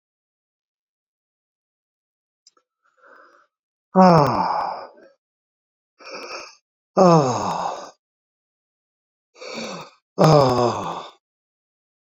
{"exhalation_length": "12.0 s", "exhalation_amplitude": 27663, "exhalation_signal_mean_std_ratio": 0.33, "survey_phase": "beta (2021-08-13 to 2022-03-07)", "age": "45-64", "gender": "Male", "wearing_mask": "No", "symptom_cough_any": true, "symptom_fatigue": true, "symptom_headache": true, "symptom_change_to_sense_of_smell_or_taste": true, "symptom_loss_of_taste": true, "smoker_status": "Never smoked", "respiratory_condition_asthma": false, "respiratory_condition_other": false, "recruitment_source": "Test and Trace", "submission_delay": "2 days", "covid_test_result": "Positive", "covid_test_method": "RT-qPCR", "covid_ct_value": 24.8, "covid_ct_gene": "ORF1ab gene", "covid_ct_mean": 25.5, "covid_viral_load": "4300 copies/ml", "covid_viral_load_category": "Minimal viral load (< 10K copies/ml)"}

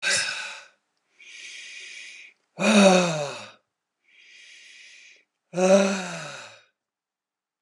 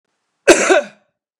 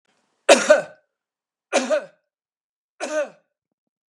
{"exhalation_length": "7.6 s", "exhalation_amplitude": 22981, "exhalation_signal_mean_std_ratio": 0.39, "cough_length": "1.4 s", "cough_amplitude": 32768, "cough_signal_mean_std_ratio": 0.38, "three_cough_length": "4.1 s", "three_cough_amplitude": 32767, "three_cough_signal_mean_std_ratio": 0.29, "survey_phase": "beta (2021-08-13 to 2022-03-07)", "age": "65+", "gender": "Male", "wearing_mask": "No", "symptom_none": true, "smoker_status": "Never smoked", "respiratory_condition_asthma": false, "respiratory_condition_other": false, "recruitment_source": "REACT", "submission_delay": "2 days", "covid_test_result": "Negative", "covid_test_method": "RT-qPCR", "influenza_a_test_result": "Negative", "influenza_b_test_result": "Negative"}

